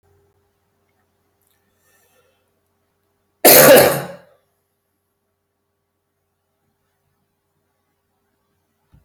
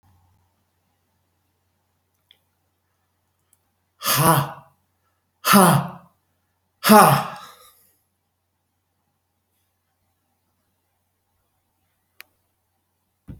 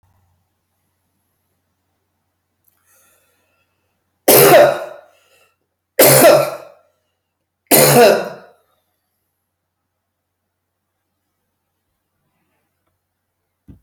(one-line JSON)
{"cough_length": "9.0 s", "cough_amplitude": 32768, "cough_signal_mean_std_ratio": 0.21, "exhalation_length": "13.4 s", "exhalation_amplitude": 32767, "exhalation_signal_mean_std_ratio": 0.23, "three_cough_length": "13.8 s", "three_cough_amplitude": 32768, "three_cough_signal_mean_std_ratio": 0.29, "survey_phase": "beta (2021-08-13 to 2022-03-07)", "age": "65+", "gender": "Male", "wearing_mask": "No", "symptom_none": true, "smoker_status": "Never smoked", "respiratory_condition_asthma": false, "respiratory_condition_other": false, "recruitment_source": "REACT", "submission_delay": "5 days", "covid_test_result": "Negative", "covid_test_method": "RT-qPCR"}